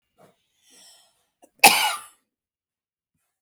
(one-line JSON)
{"cough_length": "3.4 s", "cough_amplitude": 32768, "cough_signal_mean_std_ratio": 0.2, "survey_phase": "beta (2021-08-13 to 2022-03-07)", "age": "45-64", "gender": "Female", "wearing_mask": "No", "symptom_cough_any": true, "symptom_runny_or_blocked_nose": true, "symptom_headache": true, "symptom_onset": "12 days", "smoker_status": "Never smoked", "respiratory_condition_asthma": true, "respiratory_condition_other": false, "recruitment_source": "REACT", "submission_delay": "0 days", "covid_test_result": "Negative", "covid_test_method": "RT-qPCR", "influenza_a_test_result": "Unknown/Void", "influenza_b_test_result": "Unknown/Void"}